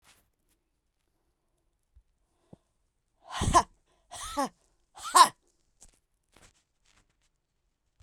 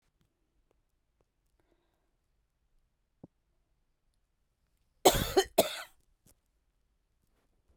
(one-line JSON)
{"exhalation_length": "8.0 s", "exhalation_amplitude": 20572, "exhalation_signal_mean_std_ratio": 0.19, "cough_length": "7.8 s", "cough_amplitude": 14382, "cough_signal_mean_std_ratio": 0.17, "survey_phase": "beta (2021-08-13 to 2022-03-07)", "age": "45-64", "gender": "Female", "wearing_mask": "No", "symptom_cough_any": true, "symptom_new_continuous_cough": true, "symptom_runny_or_blocked_nose": true, "symptom_sore_throat": true, "symptom_abdominal_pain": true, "symptom_headache": true, "smoker_status": "Never smoked", "respiratory_condition_asthma": false, "respiratory_condition_other": false, "recruitment_source": "REACT", "submission_delay": "1 day", "covid_test_result": "Negative", "covid_test_method": "RT-qPCR"}